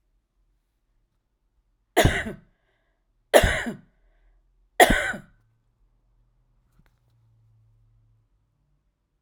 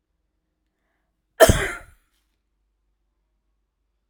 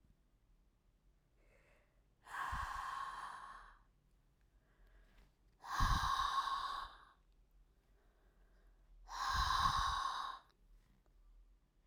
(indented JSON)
{
  "three_cough_length": "9.2 s",
  "three_cough_amplitude": 32767,
  "three_cough_signal_mean_std_ratio": 0.22,
  "cough_length": "4.1 s",
  "cough_amplitude": 32768,
  "cough_signal_mean_std_ratio": 0.18,
  "exhalation_length": "11.9 s",
  "exhalation_amplitude": 2391,
  "exhalation_signal_mean_std_ratio": 0.47,
  "survey_phase": "alpha (2021-03-01 to 2021-08-12)",
  "age": "65+",
  "gender": "Female",
  "wearing_mask": "No",
  "symptom_none": true,
  "symptom_onset": "12 days",
  "smoker_status": "Never smoked",
  "respiratory_condition_asthma": false,
  "respiratory_condition_other": true,
  "recruitment_source": "REACT",
  "submission_delay": "1 day",
  "covid_test_result": "Negative",
  "covid_test_method": "RT-qPCR"
}